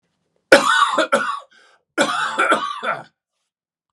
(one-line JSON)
{"cough_length": "3.9 s", "cough_amplitude": 32768, "cough_signal_mean_std_ratio": 0.49, "survey_phase": "beta (2021-08-13 to 2022-03-07)", "age": "65+", "gender": "Male", "wearing_mask": "No", "symptom_none": true, "smoker_status": "Ex-smoker", "respiratory_condition_asthma": false, "respiratory_condition_other": false, "recruitment_source": "REACT", "submission_delay": "6 days", "covid_test_result": "Negative", "covid_test_method": "RT-qPCR"}